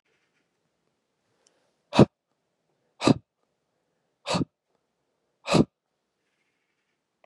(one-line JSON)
{"exhalation_length": "7.3 s", "exhalation_amplitude": 29190, "exhalation_signal_mean_std_ratio": 0.18, "survey_phase": "beta (2021-08-13 to 2022-03-07)", "age": "45-64", "gender": "Male", "wearing_mask": "No", "symptom_cough_any": true, "symptom_runny_or_blocked_nose": true, "symptom_sore_throat": true, "symptom_fatigue": true, "symptom_change_to_sense_of_smell_or_taste": true, "symptom_onset": "6 days", "smoker_status": "Never smoked", "respiratory_condition_asthma": false, "respiratory_condition_other": false, "recruitment_source": "Test and Trace", "submission_delay": "1 day", "covid_test_result": "Positive", "covid_test_method": "RT-qPCR", "covid_ct_value": 27.2, "covid_ct_gene": "ORF1ab gene", "covid_ct_mean": 28.1, "covid_viral_load": "610 copies/ml", "covid_viral_load_category": "Minimal viral load (< 10K copies/ml)"}